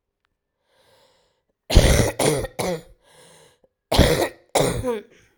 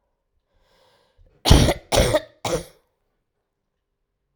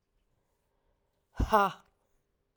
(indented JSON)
{
  "cough_length": "5.4 s",
  "cough_amplitude": 32767,
  "cough_signal_mean_std_ratio": 0.42,
  "three_cough_length": "4.4 s",
  "three_cough_amplitude": 32768,
  "three_cough_signal_mean_std_ratio": 0.29,
  "exhalation_length": "2.6 s",
  "exhalation_amplitude": 9982,
  "exhalation_signal_mean_std_ratio": 0.24,
  "survey_phase": "alpha (2021-03-01 to 2021-08-12)",
  "age": "18-44",
  "gender": "Female",
  "wearing_mask": "No",
  "symptom_new_continuous_cough": true,
  "symptom_shortness_of_breath": true,
  "symptom_fatigue": true,
  "symptom_headache": true,
  "symptom_loss_of_taste": true,
  "symptom_onset": "2 days",
  "smoker_status": "Current smoker (e-cigarettes or vapes only)",
  "respiratory_condition_asthma": true,
  "respiratory_condition_other": false,
  "recruitment_source": "Test and Trace",
  "submission_delay": "1 day",
  "covid_test_result": "Positive",
  "covid_test_method": "RT-qPCR",
  "covid_ct_value": 19.8,
  "covid_ct_gene": "ORF1ab gene",
  "covid_ct_mean": 21.0,
  "covid_viral_load": "130000 copies/ml",
  "covid_viral_load_category": "Low viral load (10K-1M copies/ml)"
}